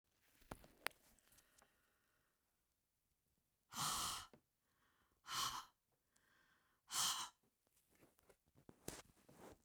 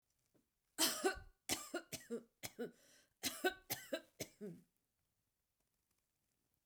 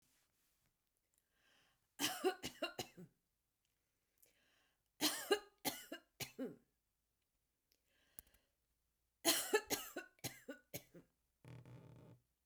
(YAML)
exhalation_length: 9.6 s
exhalation_amplitude: 3935
exhalation_signal_mean_std_ratio: 0.32
cough_length: 6.7 s
cough_amplitude: 3412
cough_signal_mean_std_ratio: 0.35
three_cough_length: 12.5 s
three_cough_amplitude: 3742
three_cough_signal_mean_std_ratio: 0.3
survey_phase: beta (2021-08-13 to 2022-03-07)
age: 65+
gender: Female
wearing_mask: 'No'
symptom_none: true
smoker_status: Ex-smoker
respiratory_condition_asthma: false
respiratory_condition_other: false
recruitment_source: REACT
submission_delay: 2 days
covid_test_result: Negative
covid_test_method: RT-qPCR